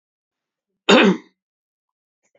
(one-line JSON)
{"cough_length": "2.4 s", "cough_amplitude": 28682, "cough_signal_mean_std_ratio": 0.27, "survey_phase": "beta (2021-08-13 to 2022-03-07)", "age": "65+", "gender": "Male", "wearing_mask": "No", "symptom_none": true, "smoker_status": "Never smoked", "respiratory_condition_asthma": false, "respiratory_condition_other": false, "recruitment_source": "REACT", "submission_delay": "1 day", "covid_test_result": "Negative", "covid_test_method": "RT-qPCR", "influenza_a_test_result": "Negative", "influenza_b_test_result": "Negative"}